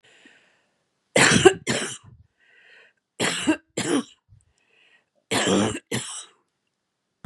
{
  "three_cough_length": "7.3 s",
  "three_cough_amplitude": 31790,
  "three_cough_signal_mean_std_ratio": 0.36,
  "survey_phase": "beta (2021-08-13 to 2022-03-07)",
  "age": "65+",
  "gender": "Female",
  "wearing_mask": "No",
  "symptom_none": true,
  "symptom_onset": "8 days",
  "smoker_status": "Never smoked",
  "respiratory_condition_asthma": false,
  "respiratory_condition_other": false,
  "recruitment_source": "REACT",
  "submission_delay": "1 day",
  "covid_test_result": "Positive",
  "covid_test_method": "RT-qPCR",
  "covid_ct_value": 24.5,
  "covid_ct_gene": "E gene",
  "influenza_a_test_result": "Negative",
  "influenza_b_test_result": "Negative"
}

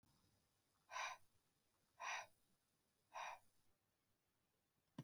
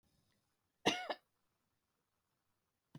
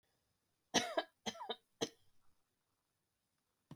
{
  "exhalation_length": "5.0 s",
  "exhalation_amplitude": 460,
  "exhalation_signal_mean_std_ratio": 0.35,
  "cough_length": "3.0 s",
  "cough_amplitude": 3595,
  "cough_signal_mean_std_ratio": 0.2,
  "three_cough_length": "3.8 s",
  "three_cough_amplitude": 3721,
  "three_cough_signal_mean_std_ratio": 0.26,
  "survey_phase": "beta (2021-08-13 to 2022-03-07)",
  "age": "45-64",
  "gender": "Female",
  "wearing_mask": "No",
  "symptom_none": true,
  "smoker_status": "Ex-smoker",
  "respiratory_condition_asthma": true,
  "respiratory_condition_other": false,
  "recruitment_source": "REACT",
  "submission_delay": "23 days",
  "covid_test_result": "Negative",
  "covid_test_method": "RT-qPCR"
}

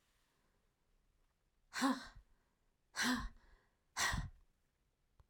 {
  "exhalation_length": "5.3 s",
  "exhalation_amplitude": 2368,
  "exhalation_signal_mean_std_ratio": 0.35,
  "survey_phase": "beta (2021-08-13 to 2022-03-07)",
  "age": "45-64",
  "gender": "Female",
  "wearing_mask": "No",
  "symptom_cough_any": true,
  "symptom_sore_throat": true,
  "symptom_fatigue": true,
  "symptom_onset": "3 days",
  "smoker_status": "Never smoked",
  "respiratory_condition_asthma": false,
  "respiratory_condition_other": false,
  "recruitment_source": "Test and Trace",
  "submission_delay": "1 day",
  "covid_test_result": "Positive",
  "covid_test_method": "ePCR"
}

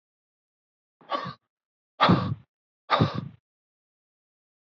{
  "exhalation_length": "4.7 s",
  "exhalation_amplitude": 17000,
  "exhalation_signal_mean_std_ratio": 0.29,
  "survey_phase": "beta (2021-08-13 to 2022-03-07)",
  "age": "45-64",
  "gender": "Male",
  "wearing_mask": "No",
  "symptom_none": true,
  "smoker_status": "Never smoked",
  "respiratory_condition_asthma": false,
  "respiratory_condition_other": false,
  "recruitment_source": "REACT",
  "submission_delay": "1 day",
  "covid_test_result": "Negative",
  "covid_test_method": "RT-qPCR"
}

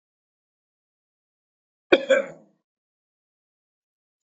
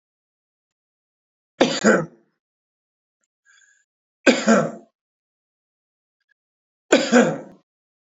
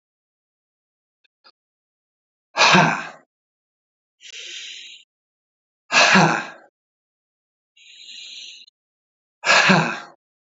{
  "cough_length": "4.3 s",
  "cough_amplitude": 27886,
  "cough_signal_mean_std_ratio": 0.17,
  "three_cough_length": "8.1 s",
  "three_cough_amplitude": 30387,
  "three_cough_signal_mean_std_ratio": 0.28,
  "exhalation_length": "10.6 s",
  "exhalation_amplitude": 29008,
  "exhalation_signal_mean_std_ratio": 0.31,
  "survey_phase": "beta (2021-08-13 to 2022-03-07)",
  "age": "45-64",
  "gender": "Male",
  "wearing_mask": "No",
  "symptom_cough_any": true,
  "symptom_onset": "12 days",
  "smoker_status": "Never smoked",
  "respiratory_condition_asthma": false,
  "respiratory_condition_other": false,
  "recruitment_source": "REACT",
  "submission_delay": "2 days",
  "covid_test_result": "Negative",
  "covid_test_method": "RT-qPCR",
  "influenza_a_test_result": "Negative",
  "influenza_b_test_result": "Negative"
}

